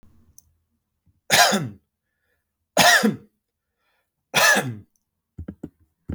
{
  "three_cough_length": "6.1 s",
  "three_cough_amplitude": 30024,
  "three_cough_signal_mean_std_ratio": 0.34,
  "survey_phase": "beta (2021-08-13 to 2022-03-07)",
  "age": "18-44",
  "gender": "Male",
  "wearing_mask": "No",
  "symptom_none": true,
  "symptom_onset": "13 days",
  "smoker_status": "Never smoked",
  "respiratory_condition_asthma": false,
  "respiratory_condition_other": false,
  "recruitment_source": "REACT",
  "submission_delay": "3 days",
  "covid_test_result": "Negative",
  "covid_test_method": "RT-qPCR",
  "influenza_a_test_result": "Negative",
  "influenza_b_test_result": "Negative"
}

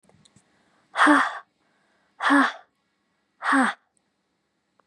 {
  "exhalation_length": "4.9 s",
  "exhalation_amplitude": 26011,
  "exhalation_signal_mean_std_ratio": 0.36,
  "survey_phase": "beta (2021-08-13 to 2022-03-07)",
  "age": "18-44",
  "gender": "Female",
  "wearing_mask": "No",
  "symptom_fatigue": true,
  "symptom_headache": true,
  "symptom_change_to_sense_of_smell_or_taste": true,
  "symptom_loss_of_taste": true,
  "symptom_onset": "3 days",
  "smoker_status": "Never smoked",
  "respiratory_condition_asthma": false,
  "respiratory_condition_other": false,
  "recruitment_source": "REACT",
  "submission_delay": "2 days",
  "covid_test_result": "Positive",
  "covid_test_method": "RT-qPCR",
  "covid_ct_value": 20.0,
  "covid_ct_gene": "E gene",
  "influenza_a_test_result": "Negative",
  "influenza_b_test_result": "Negative"
}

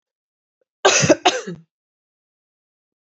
{
  "cough_length": "3.2 s",
  "cough_amplitude": 26923,
  "cough_signal_mean_std_ratio": 0.29,
  "survey_phase": "beta (2021-08-13 to 2022-03-07)",
  "age": "18-44",
  "gender": "Female",
  "wearing_mask": "No",
  "symptom_cough_any": true,
  "symptom_runny_or_blocked_nose": true,
  "symptom_headache": true,
  "symptom_onset": "3 days",
  "smoker_status": "Never smoked",
  "respiratory_condition_asthma": false,
  "respiratory_condition_other": false,
  "recruitment_source": "Test and Trace",
  "submission_delay": "2 days",
  "covid_test_result": "Positive",
  "covid_test_method": "RT-qPCR",
  "covid_ct_value": 15.9,
  "covid_ct_gene": "ORF1ab gene",
  "covid_ct_mean": 16.3,
  "covid_viral_load": "4400000 copies/ml",
  "covid_viral_load_category": "High viral load (>1M copies/ml)"
}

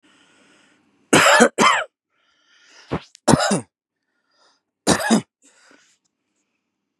{
  "three_cough_length": "7.0 s",
  "three_cough_amplitude": 32767,
  "three_cough_signal_mean_std_ratio": 0.33,
  "survey_phase": "beta (2021-08-13 to 2022-03-07)",
  "age": "45-64",
  "gender": "Male",
  "wearing_mask": "No",
  "symptom_runny_or_blocked_nose": true,
  "symptom_headache": true,
  "symptom_onset": "6 days",
  "smoker_status": "Ex-smoker",
  "respiratory_condition_asthma": false,
  "respiratory_condition_other": false,
  "recruitment_source": "REACT",
  "submission_delay": "6 days",
  "covid_test_result": "Negative",
  "covid_test_method": "RT-qPCR",
  "influenza_a_test_result": "Negative",
  "influenza_b_test_result": "Negative"
}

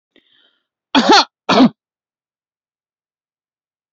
{
  "cough_length": "3.9 s",
  "cough_amplitude": 32767,
  "cough_signal_mean_std_ratio": 0.28,
  "survey_phase": "beta (2021-08-13 to 2022-03-07)",
  "age": "45-64",
  "gender": "Female",
  "wearing_mask": "No",
  "symptom_none": true,
  "smoker_status": "Never smoked",
  "respiratory_condition_asthma": false,
  "respiratory_condition_other": false,
  "recruitment_source": "REACT",
  "submission_delay": "1 day",
  "covid_test_result": "Negative",
  "covid_test_method": "RT-qPCR",
  "influenza_a_test_result": "Negative",
  "influenza_b_test_result": "Negative"
}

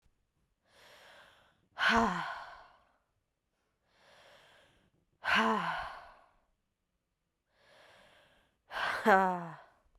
{
  "exhalation_length": "10.0 s",
  "exhalation_amplitude": 8882,
  "exhalation_signal_mean_std_ratio": 0.33,
  "survey_phase": "beta (2021-08-13 to 2022-03-07)",
  "age": "18-44",
  "gender": "Female",
  "wearing_mask": "No",
  "symptom_cough_any": true,
  "symptom_new_continuous_cough": true,
  "symptom_runny_or_blocked_nose": true,
  "symptom_shortness_of_breath": true,
  "symptom_sore_throat": true,
  "symptom_abdominal_pain": true,
  "symptom_fatigue": true,
  "symptom_headache": true,
  "smoker_status": "Never smoked",
  "respiratory_condition_asthma": false,
  "respiratory_condition_other": false,
  "recruitment_source": "Test and Trace",
  "submission_delay": "2 days",
  "covid_test_result": "Positive",
  "covid_test_method": "RT-qPCR",
  "covid_ct_value": 26.6,
  "covid_ct_gene": "ORF1ab gene",
  "covid_ct_mean": 27.4,
  "covid_viral_load": "1000 copies/ml",
  "covid_viral_load_category": "Minimal viral load (< 10K copies/ml)"
}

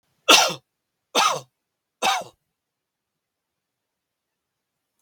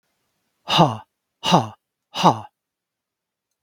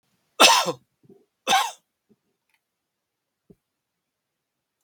{
  "three_cough_length": "5.0 s",
  "three_cough_amplitude": 32768,
  "three_cough_signal_mean_std_ratio": 0.26,
  "exhalation_length": "3.6 s",
  "exhalation_amplitude": 32767,
  "exhalation_signal_mean_std_ratio": 0.3,
  "cough_length": "4.8 s",
  "cough_amplitude": 32768,
  "cough_signal_mean_std_ratio": 0.24,
  "survey_phase": "beta (2021-08-13 to 2022-03-07)",
  "age": "45-64",
  "gender": "Male",
  "wearing_mask": "No",
  "symptom_none": true,
  "smoker_status": "Ex-smoker",
  "respiratory_condition_asthma": false,
  "respiratory_condition_other": false,
  "recruitment_source": "REACT",
  "submission_delay": "3 days",
  "covid_test_result": "Negative",
  "covid_test_method": "RT-qPCR",
  "influenza_a_test_result": "Unknown/Void",
  "influenza_b_test_result": "Unknown/Void"
}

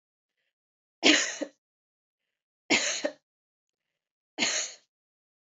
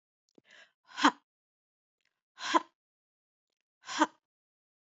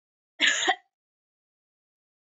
{
  "three_cough_length": "5.5 s",
  "three_cough_amplitude": 17094,
  "three_cough_signal_mean_std_ratio": 0.3,
  "exhalation_length": "4.9 s",
  "exhalation_amplitude": 10115,
  "exhalation_signal_mean_std_ratio": 0.2,
  "cough_length": "2.4 s",
  "cough_amplitude": 11978,
  "cough_signal_mean_std_ratio": 0.29,
  "survey_phase": "beta (2021-08-13 to 2022-03-07)",
  "age": "45-64",
  "gender": "Female",
  "wearing_mask": "No",
  "symptom_runny_or_blocked_nose": true,
  "symptom_sore_throat": true,
  "symptom_fatigue": true,
  "symptom_fever_high_temperature": true,
  "symptom_headache": true,
  "symptom_onset": "3 days",
  "smoker_status": "Never smoked",
  "respiratory_condition_asthma": false,
  "respiratory_condition_other": false,
  "recruitment_source": "Test and Trace",
  "submission_delay": "2 days",
  "covid_test_result": "Positive",
  "covid_test_method": "ePCR"
}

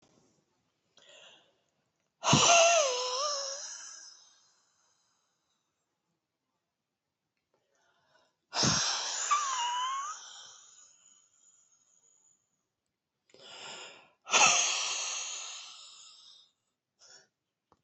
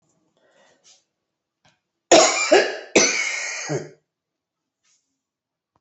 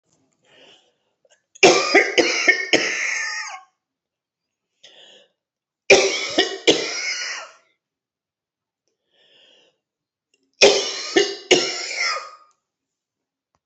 {
  "exhalation_length": "17.8 s",
  "exhalation_amplitude": 10654,
  "exhalation_signal_mean_std_ratio": 0.37,
  "cough_length": "5.8 s",
  "cough_amplitude": 29233,
  "cough_signal_mean_std_ratio": 0.34,
  "three_cough_length": "13.7 s",
  "three_cough_amplitude": 30906,
  "three_cough_signal_mean_std_ratio": 0.38,
  "survey_phase": "beta (2021-08-13 to 2022-03-07)",
  "age": "65+",
  "gender": "Female",
  "wearing_mask": "No",
  "symptom_cough_any": true,
  "symptom_runny_or_blocked_nose": true,
  "symptom_shortness_of_breath": true,
  "symptom_onset": "12 days",
  "smoker_status": "Ex-smoker",
  "respiratory_condition_asthma": true,
  "respiratory_condition_other": false,
  "recruitment_source": "REACT",
  "submission_delay": "8 days",
  "covid_test_result": "Negative",
  "covid_test_method": "RT-qPCR"
}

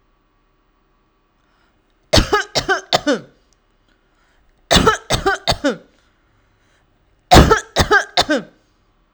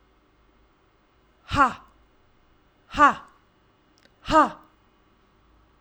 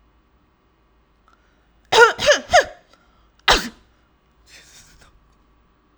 {
  "three_cough_length": "9.1 s",
  "three_cough_amplitude": 32768,
  "three_cough_signal_mean_std_ratio": 0.35,
  "exhalation_length": "5.8 s",
  "exhalation_amplitude": 21363,
  "exhalation_signal_mean_std_ratio": 0.25,
  "cough_length": "6.0 s",
  "cough_amplitude": 32768,
  "cough_signal_mean_std_ratio": 0.26,
  "survey_phase": "alpha (2021-03-01 to 2021-08-12)",
  "age": "18-44",
  "gender": "Female",
  "wearing_mask": "No",
  "symptom_none": true,
  "smoker_status": "Never smoked",
  "respiratory_condition_asthma": false,
  "respiratory_condition_other": false,
  "recruitment_source": "REACT",
  "submission_delay": "7 days",
  "covid_test_result": "Negative",
  "covid_test_method": "RT-qPCR"
}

